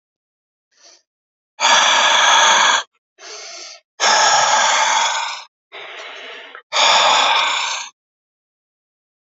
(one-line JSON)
{"exhalation_length": "9.3 s", "exhalation_amplitude": 30286, "exhalation_signal_mean_std_ratio": 0.58, "survey_phase": "alpha (2021-03-01 to 2021-08-12)", "age": "45-64", "gender": "Male", "wearing_mask": "No", "symptom_cough_any": true, "symptom_fever_high_temperature": true, "symptom_headache": true, "symptom_onset": "3 days", "smoker_status": "Ex-smoker", "respiratory_condition_asthma": true, "respiratory_condition_other": false, "recruitment_source": "Test and Trace", "submission_delay": "2 days", "covid_test_result": "Positive", "covid_test_method": "RT-qPCR", "covid_ct_value": 20.0, "covid_ct_gene": "ORF1ab gene"}